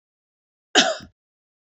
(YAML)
cough_length: 1.8 s
cough_amplitude: 26582
cough_signal_mean_std_ratio: 0.25
survey_phase: beta (2021-08-13 to 2022-03-07)
age: 45-64
gender: Female
wearing_mask: 'No'
symptom_none: true
smoker_status: Never smoked
respiratory_condition_asthma: false
respiratory_condition_other: false
recruitment_source: REACT
submission_delay: 3 days
covid_test_result: Negative
covid_test_method: RT-qPCR
influenza_a_test_result: Negative
influenza_b_test_result: Negative